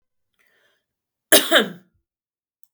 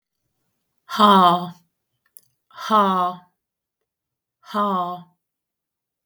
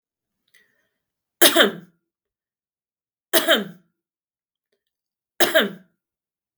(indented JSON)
{
  "cough_length": "2.7 s",
  "cough_amplitude": 32768,
  "cough_signal_mean_std_ratio": 0.24,
  "exhalation_length": "6.1 s",
  "exhalation_amplitude": 30086,
  "exhalation_signal_mean_std_ratio": 0.37,
  "three_cough_length": "6.6 s",
  "three_cough_amplitude": 32768,
  "three_cough_signal_mean_std_ratio": 0.26,
  "survey_phase": "beta (2021-08-13 to 2022-03-07)",
  "age": "45-64",
  "gender": "Female",
  "wearing_mask": "No",
  "symptom_none": true,
  "smoker_status": "Ex-smoker",
  "respiratory_condition_asthma": false,
  "respiratory_condition_other": false,
  "recruitment_source": "REACT",
  "submission_delay": "3 days",
  "covid_test_result": "Negative",
  "covid_test_method": "RT-qPCR",
  "influenza_a_test_result": "Negative",
  "influenza_b_test_result": "Negative"
}